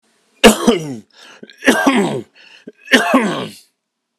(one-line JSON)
{"three_cough_length": "4.2 s", "three_cough_amplitude": 32768, "three_cough_signal_mean_std_ratio": 0.46, "survey_phase": "beta (2021-08-13 to 2022-03-07)", "age": "45-64", "gender": "Male", "wearing_mask": "No", "symptom_cough_any": true, "smoker_status": "Never smoked", "respiratory_condition_asthma": false, "respiratory_condition_other": false, "recruitment_source": "Test and Trace", "submission_delay": "1 day", "covid_test_result": "Positive", "covid_test_method": "RT-qPCR", "covid_ct_value": 23.3, "covid_ct_gene": "ORF1ab gene"}